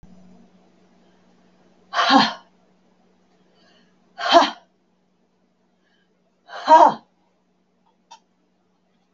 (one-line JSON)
{"exhalation_length": "9.1 s", "exhalation_amplitude": 32766, "exhalation_signal_mean_std_ratio": 0.24, "survey_phase": "beta (2021-08-13 to 2022-03-07)", "age": "65+", "gender": "Female", "wearing_mask": "No", "symptom_none": true, "smoker_status": "Never smoked", "respiratory_condition_asthma": false, "respiratory_condition_other": false, "recruitment_source": "REACT", "submission_delay": "2 days", "covid_test_result": "Negative", "covid_test_method": "RT-qPCR", "influenza_a_test_result": "Negative", "influenza_b_test_result": "Negative"}